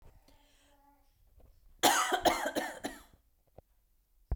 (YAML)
cough_length: 4.4 s
cough_amplitude: 11040
cough_signal_mean_std_ratio: 0.36
survey_phase: beta (2021-08-13 to 2022-03-07)
age: 18-44
gender: Female
wearing_mask: 'No'
symptom_none: true
symptom_onset: 11 days
smoker_status: Never smoked
respiratory_condition_asthma: false
respiratory_condition_other: false
recruitment_source: REACT
submission_delay: 1 day
covid_test_result: Negative
covid_test_method: RT-qPCR